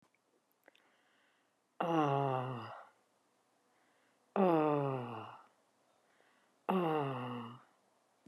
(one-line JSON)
{"exhalation_length": "8.3 s", "exhalation_amplitude": 4808, "exhalation_signal_mean_std_ratio": 0.42, "survey_phase": "beta (2021-08-13 to 2022-03-07)", "age": "45-64", "gender": "Female", "wearing_mask": "Yes", "symptom_cough_any": true, "symptom_runny_or_blocked_nose": true, "symptom_fever_high_temperature": true, "symptom_headache": true, "smoker_status": "Ex-smoker", "respiratory_condition_asthma": false, "respiratory_condition_other": false, "recruitment_source": "Test and Trace", "submission_delay": "1 day", "covid_test_result": "Positive", "covid_test_method": "RT-qPCR", "covid_ct_value": 23.2, "covid_ct_gene": "ORF1ab gene", "covid_ct_mean": 23.6, "covid_viral_load": "17000 copies/ml", "covid_viral_load_category": "Low viral load (10K-1M copies/ml)"}